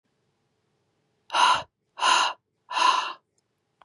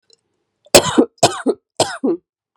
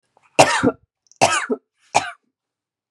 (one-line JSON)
{"exhalation_length": "3.8 s", "exhalation_amplitude": 14615, "exhalation_signal_mean_std_ratio": 0.41, "cough_length": "2.6 s", "cough_amplitude": 32768, "cough_signal_mean_std_ratio": 0.37, "three_cough_length": "2.9 s", "three_cough_amplitude": 32768, "three_cough_signal_mean_std_ratio": 0.35, "survey_phase": "beta (2021-08-13 to 2022-03-07)", "age": "18-44", "gender": "Female", "wearing_mask": "No", "symptom_cough_any": true, "symptom_runny_or_blocked_nose": true, "symptom_shortness_of_breath": true, "symptom_sore_throat": true, "symptom_diarrhoea": true, "symptom_fatigue": true, "symptom_fever_high_temperature": true, "symptom_headache": true, "symptom_other": true, "smoker_status": "Ex-smoker", "respiratory_condition_asthma": false, "respiratory_condition_other": false, "recruitment_source": "Test and Trace", "submission_delay": "1 day", "covid_test_result": "Positive", "covid_test_method": "LFT"}